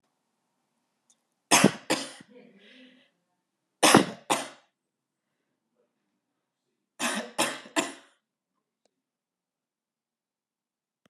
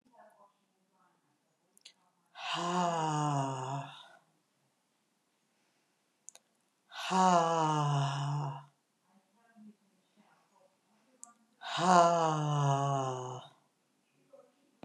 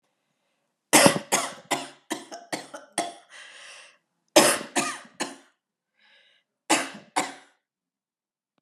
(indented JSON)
{
  "three_cough_length": "11.1 s",
  "three_cough_amplitude": 28227,
  "three_cough_signal_mean_std_ratio": 0.23,
  "exhalation_length": "14.8 s",
  "exhalation_amplitude": 11433,
  "exhalation_signal_mean_std_ratio": 0.44,
  "cough_length": "8.6 s",
  "cough_amplitude": 31280,
  "cough_signal_mean_std_ratio": 0.31,
  "survey_phase": "beta (2021-08-13 to 2022-03-07)",
  "age": "45-64",
  "gender": "Female",
  "wearing_mask": "No",
  "symptom_none": true,
  "smoker_status": "Ex-smoker",
  "respiratory_condition_asthma": false,
  "respiratory_condition_other": false,
  "recruitment_source": "REACT",
  "submission_delay": "2 days",
  "covid_test_result": "Negative",
  "covid_test_method": "RT-qPCR",
  "influenza_a_test_result": "Negative",
  "influenza_b_test_result": "Negative"
}